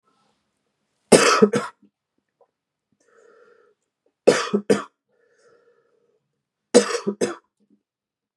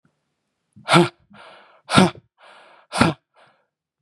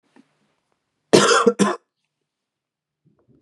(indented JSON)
{
  "three_cough_length": "8.4 s",
  "three_cough_amplitude": 32768,
  "three_cough_signal_mean_std_ratio": 0.26,
  "exhalation_length": "4.0 s",
  "exhalation_amplitude": 32768,
  "exhalation_signal_mean_std_ratio": 0.29,
  "cough_length": "3.4 s",
  "cough_amplitude": 32486,
  "cough_signal_mean_std_ratio": 0.3,
  "survey_phase": "beta (2021-08-13 to 2022-03-07)",
  "age": "18-44",
  "gender": "Male",
  "wearing_mask": "No",
  "symptom_none": true,
  "smoker_status": "Ex-smoker",
  "respiratory_condition_asthma": false,
  "respiratory_condition_other": false,
  "recruitment_source": "REACT",
  "submission_delay": "2 days",
  "covid_test_result": "Negative",
  "covid_test_method": "RT-qPCR",
  "influenza_a_test_result": "Negative",
  "influenza_b_test_result": "Negative"
}